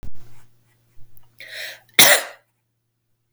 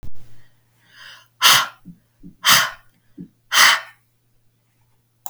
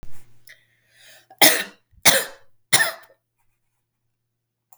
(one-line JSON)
{"cough_length": "3.3 s", "cough_amplitude": 32768, "cough_signal_mean_std_ratio": 0.32, "exhalation_length": "5.3 s", "exhalation_amplitude": 32768, "exhalation_signal_mean_std_ratio": 0.36, "three_cough_length": "4.8 s", "three_cough_amplitude": 32768, "three_cough_signal_mean_std_ratio": 0.29, "survey_phase": "beta (2021-08-13 to 2022-03-07)", "age": "18-44", "gender": "Female", "wearing_mask": "No", "symptom_none": true, "smoker_status": "Never smoked", "respiratory_condition_asthma": false, "respiratory_condition_other": false, "recruitment_source": "REACT", "submission_delay": "2 days", "covid_test_result": "Negative", "covid_test_method": "RT-qPCR", "influenza_a_test_result": "Negative", "influenza_b_test_result": "Negative"}